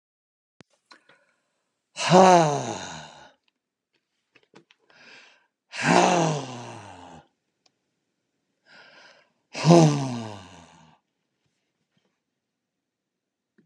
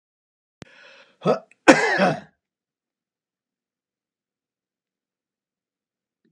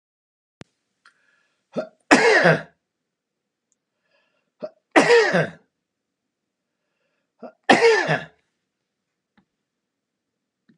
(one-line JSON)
{"exhalation_length": "13.7 s", "exhalation_amplitude": 28214, "exhalation_signal_mean_std_ratio": 0.28, "cough_length": "6.3 s", "cough_amplitude": 32768, "cough_signal_mean_std_ratio": 0.21, "three_cough_length": "10.8 s", "three_cough_amplitude": 32768, "three_cough_signal_mean_std_ratio": 0.29, "survey_phase": "alpha (2021-03-01 to 2021-08-12)", "age": "65+", "gender": "Male", "wearing_mask": "No", "symptom_none": true, "smoker_status": "Never smoked", "respiratory_condition_asthma": false, "respiratory_condition_other": false, "recruitment_source": "REACT", "submission_delay": "1 day", "covid_test_result": "Negative", "covid_test_method": "RT-qPCR"}